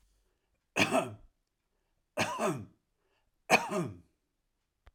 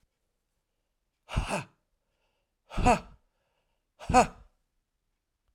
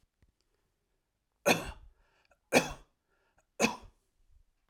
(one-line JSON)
{"cough_length": "4.9 s", "cough_amplitude": 12788, "cough_signal_mean_std_ratio": 0.35, "exhalation_length": "5.5 s", "exhalation_amplitude": 13477, "exhalation_signal_mean_std_ratio": 0.25, "three_cough_length": "4.7 s", "three_cough_amplitude": 13600, "three_cough_signal_mean_std_ratio": 0.24, "survey_phase": "alpha (2021-03-01 to 2021-08-12)", "age": "45-64", "gender": "Male", "wearing_mask": "No", "symptom_fatigue": true, "symptom_onset": "12 days", "smoker_status": "Ex-smoker", "respiratory_condition_asthma": false, "respiratory_condition_other": false, "recruitment_source": "REACT", "submission_delay": "1 day", "covid_test_result": "Negative", "covid_test_method": "RT-qPCR"}